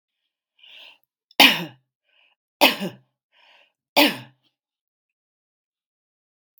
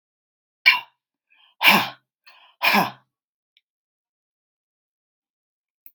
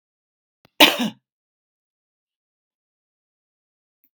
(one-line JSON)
{"three_cough_length": "6.6 s", "three_cough_amplitude": 32767, "three_cough_signal_mean_std_ratio": 0.22, "exhalation_length": "5.9 s", "exhalation_amplitude": 32768, "exhalation_signal_mean_std_ratio": 0.25, "cough_length": "4.2 s", "cough_amplitude": 32768, "cough_signal_mean_std_ratio": 0.16, "survey_phase": "beta (2021-08-13 to 2022-03-07)", "age": "65+", "gender": "Female", "wearing_mask": "No", "symptom_none": true, "smoker_status": "Current smoker (1 to 10 cigarettes per day)", "respiratory_condition_asthma": false, "respiratory_condition_other": false, "recruitment_source": "REACT", "submission_delay": "3 days", "covid_test_result": "Negative", "covid_test_method": "RT-qPCR", "influenza_a_test_result": "Negative", "influenza_b_test_result": "Negative"}